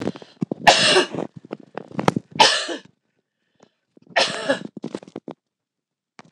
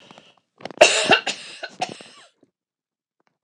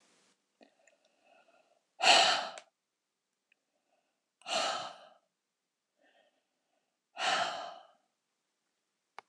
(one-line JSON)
{"three_cough_length": "6.3 s", "three_cough_amplitude": 26028, "three_cough_signal_mean_std_ratio": 0.36, "cough_length": "3.4 s", "cough_amplitude": 26028, "cough_signal_mean_std_ratio": 0.29, "exhalation_length": "9.3 s", "exhalation_amplitude": 12243, "exhalation_signal_mean_std_ratio": 0.27, "survey_phase": "alpha (2021-03-01 to 2021-08-12)", "age": "45-64", "gender": "Female", "wearing_mask": "No", "symptom_none": true, "smoker_status": "Never smoked", "respiratory_condition_asthma": false, "respiratory_condition_other": false, "recruitment_source": "REACT", "submission_delay": "2 days", "covid_test_result": "Negative", "covid_test_method": "RT-qPCR"}